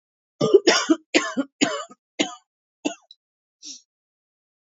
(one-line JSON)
{"cough_length": "4.7 s", "cough_amplitude": 27111, "cough_signal_mean_std_ratio": 0.32, "survey_phase": "beta (2021-08-13 to 2022-03-07)", "age": "45-64", "gender": "Female", "wearing_mask": "No", "symptom_cough_any": true, "symptom_runny_or_blocked_nose": true, "symptom_sore_throat": true, "symptom_diarrhoea": true, "symptom_fatigue": true, "symptom_headache": true, "symptom_other": true, "symptom_onset": "3 days", "smoker_status": "Never smoked", "respiratory_condition_asthma": false, "respiratory_condition_other": false, "recruitment_source": "Test and Trace", "submission_delay": "2 days", "covid_test_result": "Positive", "covid_test_method": "RT-qPCR", "covid_ct_value": 16.5, "covid_ct_gene": "ORF1ab gene"}